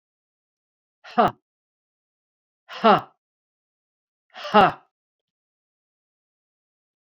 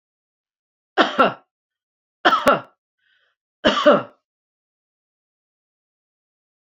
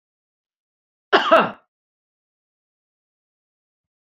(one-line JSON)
{"exhalation_length": "7.1 s", "exhalation_amplitude": 27648, "exhalation_signal_mean_std_ratio": 0.21, "three_cough_length": "6.7 s", "three_cough_amplitude": 28311, "three_cough_signal_mean_std_ratio": 0.28, "cough_length": "4.0 s", "cough_amplitude": 30792, "cough_signal_mean_std_ratio": 0.21, "survey_phase": "beta (2021-08-13 to 2022-03-07)", "age": "65+", "gender": "Female", "wearing_mask": "No", "symptom_none": true, "smoker_status": "Current smoker (1 to 10 cigarettes per day)", "respiratory_condition_asthma": false, "respiratory_condition_other": false, "recruitment_source": "REACT", "submission_delay": "2 days", "covid_test_result": "Negative", "covid_test_method": "RT-qPCR"}